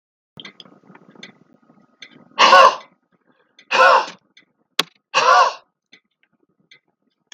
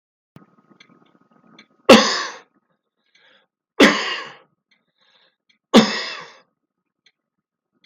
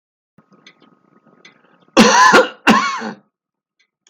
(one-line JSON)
{"exhalation_length": "7.3 s", "exhalation_amplitude": 32768, "exhalation_signal_mean_std_ratio": 0.31, "three_cough_length": "7.9 s", "three_cough_amplitude": 32768, "three_cough_signal_mean_std_ratio": 0.25, "cough_length": "4.1 s", "cough_amplitude": 32768, "cough_signal_mean_std_ratio": 0.37, "survey_phase": "beta (2021-08-13 to 2022-03-07)", "age": "65+", "gender": "Male", "wearing_mask": "No", "symptom_none": true, "smoker_status": "Never smoked", "respiratory_condition_asthma": false, "respiratory_condition_other": false, "recruitment_source": "REACT", "submission_delay": "1 day", "covid_test_result": "Negative", "covid_test_method": "RT-qPCR"}